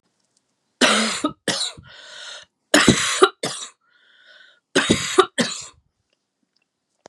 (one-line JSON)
{"three_cough_length": "7.1 s", "three_cough_amplitude": 32768, "three_cough_signal_mean_std_ratio": 0.38, "survey_phase": "beta (2021-08-13 to 2022-03-07)", "age": "45-64", "gender": "Female", "wearing_mask": "No", "symptom_new_continuous_cough": true, "symptom_sore_throat": true, "symptom_diarrhoea": true, "symptom_headache": true, "symptom_loss_of_taste": true, "smoker_status": "Never smoked", "respiratory_condition_asthma": false, "respiratory_condition_other": false, "recruitment_source": "Test and Trace", "submission_delay": "1 day", "covid_test_result": "Positive", "covid_test_method": "LFT"}